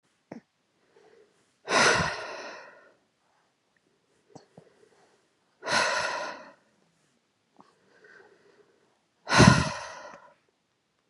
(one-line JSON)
{"exhalation_length": "11.1 s", "exhalation_amplitude": 27197, "exhalation_signal_mean_std_ratio": 0.28, "survey_phase": "beta (2021-08-13 to 2022-03-07)", "age": "18-44", "gender": "Female", "wearing_mask": "No", "symptom_none": true, "smoker_status": "Never smoked", "respiratory_condition_asthma": true, "respiratory_condition_other": false, "recruitment_source": "REACT", "submission_delay": "0 days", "covid_test_result": "Negative", "covid_test_method": "RT-qPCR"}